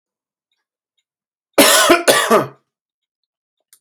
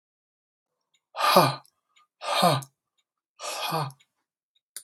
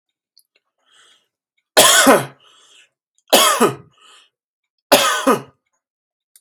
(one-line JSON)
{"cough_length": "3.8 s", "cough_amplitude": 32768, "cough_signal_mean_std_ratio": 0.36, "exhalation_length": "4.8 s", "exhalation_amplitude": 21752, "exhalation_signal_mean_std_ratio": 0.35, "three_cough_length": "6.4 s", "three_cough_amplitude": 32768, "three_cough_signal_mean_std_ratio": 0.35, "survey_phase": "alpha (2021-03-01 to 2021-08-12)", "age": "18-44", "gender": "Male", "wearing_mask": "No", "symptom_none": true, "smoker_status": "Never smoked", "respiratory_condition_asthma": false, "respiratory_condition_other": false, "recruitment_source": "REACT", "submission_delay": "2 days", "covid_test_result": "Negative", "covid_test_method": "RT-qPCR"}